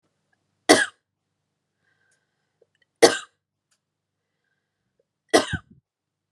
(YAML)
three_cough_length: 6.3 s
three_cough_amplitude: 32767
three_cough_signal_mean_std_ratio: 0.18
survey_phase: beta (2021-08-13 to 2022-03-07)
age: 18-44
gender: Female
wearing_mask: 'No'
symptom_other: true
symptom_onset: 9 days
smoker_status: Never smoked
respiratory_condition_asthma: false
respiratory_condition_other: false
recruitment_source: REACT
submission_delay: 1 day
covid_test_result: Negative
covid_test_method: RT-qPCR
influenza_a_test_result: Negative
influenza_b_test_result: Negative